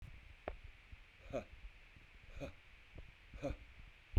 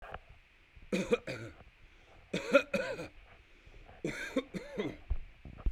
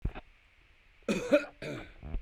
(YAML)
exhalation_length: 4.2 s
exhalation_amplitude: 2616
exhalation_signal_mean_std_ratio: 0.41
three_cough_length: 5.7 s
three_cough_amplitude: 9042
three_cough_signal_mean_std_ratio: 0.44
cough_length: 2.2 s
cough_amplitude: 8310
cough_signal_mean_std_ratio: 0.43
survey_phase: beta (2021-08-13 to 2022-03-07)
age: 45-64
gender: Male
wearing_mask: 'No'
symptom_none: true
smoker_status: Never smoked
respiratory_condition_asthma: false
respiratory_condition_other: false
recruitment_source: REACT
submission_delay: 1 day
covid_test_result: Negative
covid_test_method: RT-qPCR
influenza_a_test_result: Negative
influenza_b_test_result: Negative